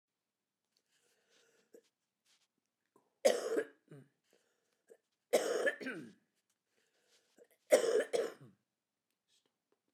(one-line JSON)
{"three_cough_length": "9.9 s", "three_cough_amplitude": 6582, "three_cough_signal_mean_std_ratio": 0.28, "survey_phase": "beta (2021-08-13 to 2022-03-07)", "age": "65+", "gender": "Female", "wearing_mask": "No", "symptom_none": true, "smoker_status": "Never smoked", "respiratory_condition_asthma": true, "respiratory_condition_other": false, "recruitment_source": "REACT", "submission_delay": "1 day", "covid_test_result": "Negative", "covid_test_method": "RT-qPCR"}